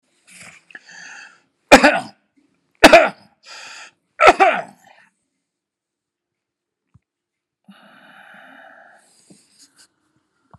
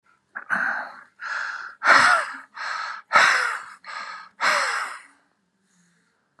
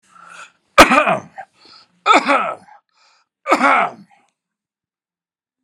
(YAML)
cough_length: 10.6 s
cough_amplitude: 32768
cough_signal_mean_std_ratio: 0.22
exhalation_length: 6.4 s
exhalation_amplitude: 25976
exhalation_signal_mean_std_ratio: 0.49
three_cough_length: 5.6 s
three_cough_amplitude: 32768
three_cough_signal_mean_std_ratio: 0.35
survey_phase: alpha (2021-03-01 to 2021-08-12)
age: 65+
gender: Male
wearing_mask: 'No'
symptom_none: true
smoker_status: Ex-smoker
respiratory_condition_asthma: false
respiratory_condition_other: false
recruitment_source: REACT
submission_delay: 4 days
covid_test_result: Negative
covid_test_method: RT-qPCR